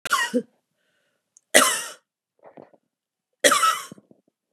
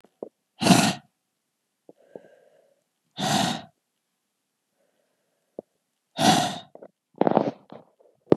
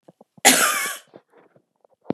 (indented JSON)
{
  "three_cough_length": "4.5 s",
  "three_cough_amplitude": 32768,
  "three_cough_signal_mean_std_ratio": 0.34,
  "exhalation_length": "8.4 s",
  "exhalation_amplitude": 31249,
  "exhalation_signal_mean_std_ratio": 0.29,
  "cough_length": "2.1 s",
  "cough_amplitude": 32768,
  "cough_signal_mean_std_ratio": 0.35,
  "survey_phase": "beta (2021-08-13 to 2022-03-07)",
  "age": "45-64",
  "gender": "Female",
  "wearing_mask": "No",
  "symptom_cough_any": true,
  "symptom_runny_or_blocked_nose": true,
  "symptom_shortness_of_breath": true,
  "symptom_fatigue": true,
  "symptom_headache": true,
  "symptom_onset": "8 days",
  "smoker_status": "Never smoked",
  "respiratory_condition_asthma": false,
  "respiratory_condition_other": false,
  "recruitment_source": "Test and Trace",
  "submission_delay": "1 day",
  "covid_test_result": "Positive",
  "covid_test_method": "RT-qPCR",
  "covid_ct_value": 18.5,
  "covid_ct_gene": "ORF1ab gene"
}